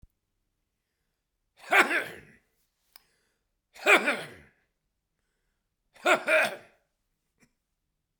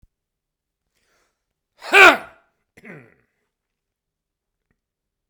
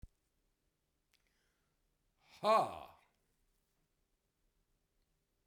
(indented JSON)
{
  "three_cough_length": "8.2 s",
  "three_cough_amplitude": 20171,
  "three_cough_signal_mean_std_ratio": 0.27,
  "cough_length": "5.3 s",
  "cough_amplitude": 32768,
  "cough_signal_mean_std_ratio": 0.17,
  "exhalation_length": "5.5 s",
  "exhalation_amplitude": 3312,
  "exhalation_signal_mean_std_ratio": 0.19,
  "survey_phase": "beta (2021-08-13 to 2022-03-07)",
  "age": "65+",
  "gender": "Male",
  "wearing_mask": "No",
  "symptom_none": true,
  "smoker_status": "Ex-smoker",
  "respiratory_condition_asthma": true,
  "respiratory_condition_other": false,
  "recruitment_source": "REACT",
  "submission_delay": "1 day",
  "covid_test_result": "Negative",
  "covid_test_method": "RT-qPCR"
}